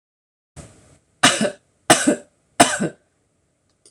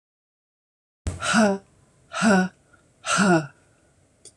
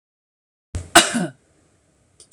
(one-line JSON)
{"three_cough_length": "3.9 s", "three_cough_amplitude": 26028, "three_cough_signal_mean_std_ratio": 0.32, "exhalation_length": "4.4 s", "exhalation_amplitude": 14680, "exhalation_signal_mean_std_ratio": 0.43, "cough_length": "2.3 s", "cough_amplitude": 26028, "cough_signal_mean_std_ratio": 0.25, "survey_phase": "alpha (2021-03-01 to 2021-08-12)", "age": "45-64", "gender": "Female", "wearing_mask": "No", "symptom_none": true, "smoker_status": "Ex-smoker", "respiratory_condition_asthma": false, "respiratory_condition_other": false, "recruitment_source": "REACT", "submission_delay": "1 day", "covid_test_result": "Negative", "covid_test_method": "RT-qPCR"}